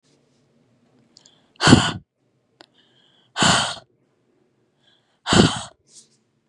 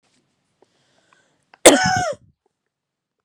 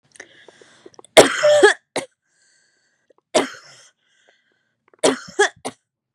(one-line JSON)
{"exhalation_length": "6.5 s", "exhalation_amplitude": 32768, "exhalation_signal_mean_std_ratio": 0.28, "cough_length": "3.2 s", "cough_amplitude": 32768, "cough_signal_mean_std_ratio": 0.25, "three_cough_length": "6.1 s", "three_cough_amplitude": 32768, "three_cough_signal_mean_std_ratio": 0.3, "survey_phase": "beta (2021-08-13 to 2022-03-07)", "age": "18-44", "gender": "Female", "wearing_mask": "No", "symptom_none": true, "smoker_status": "Never smoked", "respiratory_condition_asthma": false, "respiratory_condition_other": false, "recruitment_source": "REACT", "submission_delay": "2 days", "covid_test_result": "Negative", "covid_test_method": "RT-qPCR", "influenza_a_test_result": "Negative", "influenza_b_test_result": "Negative"}